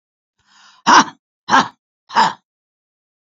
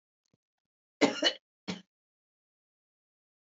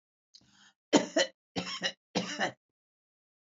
{
  "exhalation_length": "3.2 s",
  "exhalation_amplitude": 29882,
  "exhalation_signal_mean_std_ratio": 0.31,
  "cough_length": "3.4 s",
  "cough_amplitude": 9128,
  "cough_signal_mean_std_ratio": 0.21,
  "three_cough_length": "3.5 s",
  "three_cough_amplitude": 13002,
  "three_cough_signal_mean_std_ratio": 0.33,
  "survey_phase": "beta (2021-08-13 to 2022-03-07)",
  "age": "65+",
  "gender": "Female",
  "wearing_mask": "No",
  "symptom_none": true,
  "smoker_status": "Ex-smoker",
  "respiratory_condition_asthma": false,
  "respiratory_condition_other": false,
  "recruitment_source": "REACT",
  "submission_delay": "2 days",
  "covid_test_result": "Negative",
  "covid_test_method": "RT-qPCR",
  "influenza_a_test_result": "Negative",
  "influenza_b_test_result": "Negative"
}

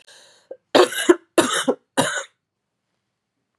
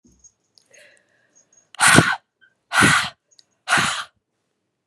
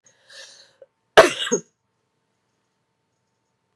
{
  "three_cough_length": "3.6 s",
  "three_cough_amplitude": 32024,
  "three_cough_signal_mean_std_ratio": 0.34,
  "exhalation_length": "4.9 s",
  "exhalation_amplitude": 32768,
  "exhalation_signal_mean_std_ratio": 0.35,
  "cough_length": "3.8 s",
  "cough_amplitude": 32768,
  "cough_signal_mean_std_ratio": 0.18,
  "survey_phase": "beta (2021-08-13 to 2022-03-07)",
  "age": "18-44",
  "gender": "Female",
  "wearing_mask": "No",
  "symptom_cough_any": true,
  "symptom_runny_or_blocked_nose": true,
  "symptom_fatigue": true,
  "symptom_headache": true,
  "smoker_status": "Never smoked",
  "respiratory_condition_asthma": false,
  "respiratory_condition_other": false,
  "recruitment_source": "Test and Trace",
  "submission_delay": "2 days",
  "covid_test_result": "Positive",
  "covid_test_method": "RT-qPCR",
  "covid_ct_value": 23.6,
  "covid_ct_gene": "N gene"
}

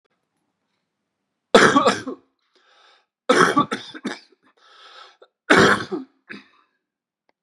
{
  "three_cough_length": "7.4 s",
  "three_cough_amplitude": 32767,
  "three_cough_signal_mean_std_ratio": 0.32,
  "survey_phase": "beta (2021-08-13 to 2022-03-07)",
  "age": "65+",
  "gender": "Male",
  "wearing_mask": "No",
  "symptom_cough_any": true,
  "symptom_runny_or_blocked_nose": true,
  "symptom_fatigue": true,
  "symptom_fever_high_temperature": true,
  "symptom_headache": true,
  "symptom_onset": "3 days",
  "smoker_status": "Never smoked",
  "respiratory_condition_asthma": false,
  "respiratory_condition_other": false,
  "recruitment_source": "Test and Trace",
  "submission_delay": "1 day",
  "covid_test_result": "Positive",
  "covid_test_method": "RT-qPCR",
  "covid_ct_value": 29.4,
  "covid_ct_gene": "N gene"
}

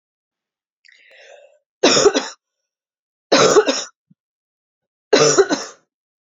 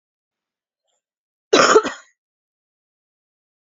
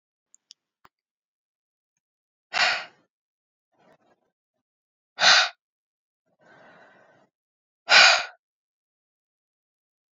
{
  "three_cough_length": "6.4 s",
  "three_cough_amplitude": 30701,
  "three_cough_signal_mean_std_ratio": 0.35,
  "cough_length": "3.8 s",
  "cough_amplitude": 29903,
  "cough_signal_mean_std_ratio": 0.23,
  "exhalation_length": "10.2 s",
  "exhalation_amplitude": 26103,
  "exhalation_signal_mean_std_ratio": 0.22,
  "survey_phase": "beta (2021-08-13 to 2022-03-07)",
  "age": "18-44",
  "gender": "Female",
  "wearing_mask": "No",
  "symptom_cough_any": true,
  "symptom_new_continuous_cough": true,
  "symptom_runny_or_blocked_nose": true,
  "symptom_fatigue": true,
  "symptom_change_to_sense_of_smell_or_taste": true,
  "symptom_loss_of_taste": true,
  "symptom_onset": "4 days",
  "smoker_status": "Never smoked",
  "respiratory_condition_asthma": false,
  "respiratory_condition_other": false,
  "recruitment_source": "Test and Trace",
  "submission_delay": "2 days",
  "covid_test_result": "Positive",
  "covid_test_method": "RT-qPCR",
  "covid_ct_value": 26.9,
  "covid_ct_gene": "N gene"
}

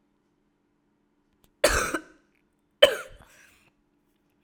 {
  "cough_length": "4.4 s",
  "cough_amplitude": 30952,
  "cough_signal_mean_std_ratio": 0.22,
  "survey_phase": "alpha (2021-03-01 to 2021-08-12)",
  "age": "18-44",
  "gender": "Female",
  "wearing_mask": "No",
  "symptom_cough_any": true,
  "symptom_shortness_of_breath": true,
  "symptom_fatigue": true,
  "symptom_headache": true,
  "symptom_onset": "3 days",
  "smoker_status": "Ex-smoker",
  "respiratory_condition_asthma": false,
  "respiratory_condition_other": false,
  "recruitment_source": "Test and Trace",
  "submission_delay": "2 days",
  "covid_test_result": "Positive",
  "covid_test_method": "RT-qPCR",
  "covid_ct_value": 30.6,
  "covid_ct_gene": "S gene",
  "covid_ct_mean": 31.8,
  "covid_viral_load": "37 copies/ml",
  "covid_viral_load_category": "Minimal viral load (< 10K copies/ml)"
}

